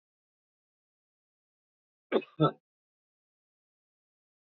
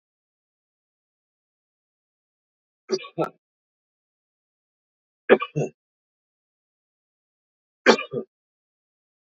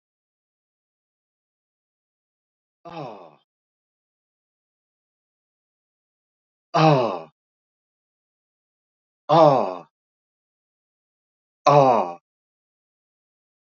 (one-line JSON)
{"cough_length": "4.5 s", "cough_amplitude": 8071, "cough_signal_mean_std_ratio": 0.15, "three_cough_length": "9.4 s", "three_cough_amplitude": 26807, "three_cough_signal_mean_std_ratio": 0.17, "exhalation_length": "13.7 s", "exhalation_amplitude": 26460, "exhalation_signal_mean_std_ratio": 0.23, "survey_phase": "beta (2021-08-13 to 2022-03-07)", "age": "65+", "gender": "Male", "wearing_mask": "No", "symptom_none": true, "smoker_status": "Never smoked", "respiratory_condition_asthma": false, "respiratory_condition_other": false, "recruitment_source": "REACT", "submission_delay": "8 days", "covid_test_result": "Negative", "covid_test_method": "RT-qPCR", "influenza_a_test_result": "Negative", "influenza_b_test_result": "Negative"}